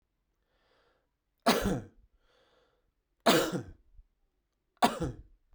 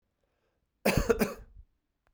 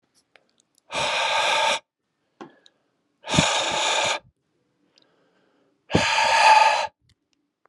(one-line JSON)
{"three_cough_length": "5.5 s", "three_cough_amplitude": 13216, "three_cough_signal_mean_std_ratio": 0.3, "cough_length": "2.1 s", "cough_amplitude": 9621, "cough_signal_mean_std_ratio": 0.33, "exhalation_length": "7.7 s", "exhalation_amplitude": 24399, "exhalation_signal_mean_std_ratio": 0.48, "survey_phase": "beta (2021-08-13 to 2022-03-07)", "age": "45-64", "gender": "Male", "wearing_mask": "No", "symptom_cough_any": true, "symptom_runny_or_blocked_nose": true, "symptom_diarrhoea": true, "symptom_fatigue": true, "symptom_fever_high_temperature": true, "symptom_change_to_sense_of_smell_or_taste": true, "smoker_status": "Never smoked", "respiratory_condition_asthma": false, "respiratory_condition_other": false, "recruitment_source": "Test and Trace", "submission_delay": "2 days", "covid_test_result": "Positive", "covid_test_method": "RT-qPCR"}